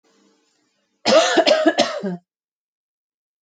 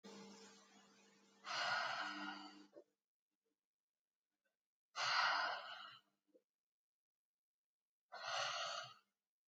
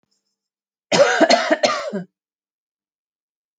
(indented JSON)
{
  "cough_length": "3.4 s",
  "cough_amplitude": 28736,
  "cough_signal_mean_std_ratio": 0.42,
  "exhalation_length": "9.5 s",
  "exhalation_amplitude": 1770,
  "exhalation_signal_mean_std_ratio": 0.43,
  "three_cough_length": "3.6 s",
  "three_cough_amplitude": 27670,
  "three_cough_signal_mean_std_ratio": 0.38,
  "survey_phase": "alpha (2021-03-01 to 2021-08-12)",
  "age": "18-44",
  "gender": "Female",
  "wearing_mask": "No",
  "symptom_cough_any": true,
  "symptom_headache": true,
  "smoker_status": "Ex-smoker",
  "respiratory_condition_asthma": false,
  "respiratory_condition_other": false,
  "recruitment_source": "REACT",
  "submission_delay": "2 days",
  "covid_test_result": "Negative",
  "covid_test_method": "RT-qPCR"
}